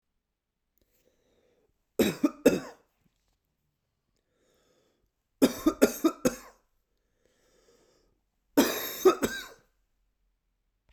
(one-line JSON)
{"three_cough_length": "10.9 s", "three_cough_amplitude": 16554, "three_cough_signal_mean_std_ratio": 0.26, "survey_phase": "beta (2021-08-13 to 2022-03-07)", "age": "18-44", "gender": "Male", "wearing_mask": "No", "symptom_none": true, "symptom_onset": "7 days", "smoker_status": "Never smoked", "respiratory_condition_asthma": false, "respiratory_condition_other": false, "recruitment_source": "REACT", "submission_delay": "1 day", "covid_test_result": "Negative", "covid_test_method": "RT-qPCR"}